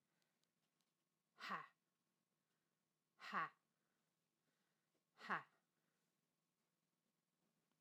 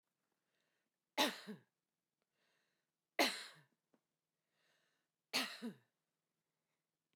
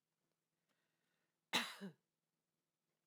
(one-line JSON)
{"exhalation_length": "7.8 s", "exhalation_amplitude": 979, "exhalation_signal_mean_std_ratio": 0.22, "three_cough_length": "7.2 s", "three_cough_amplitude": 3085, "three_cough_signal_mean_std_ratio": 0.23, "cough_length": "3.1 s", "cough_amplitude": 2254, "cough_signal_mean_std_ratio": 0.21, "survey_phase": "beta (2021-08-13 to 2022-03-07)", "age": "45-64", "gender": "Female", "wearing_mask": "No", "symptom_none": true, "smoker_status": "Never smoked", "respiratory_condition_asthma": false, "respiratory_condition_other": false, "recruitment_source": "REACT", "submission_delay": "1 day", "covid_test_result": "Negative", "covid_test_method": "RT-qPCR", "influenza_a_test_result": "Negative", "influenza_b_test_result": "Negative"}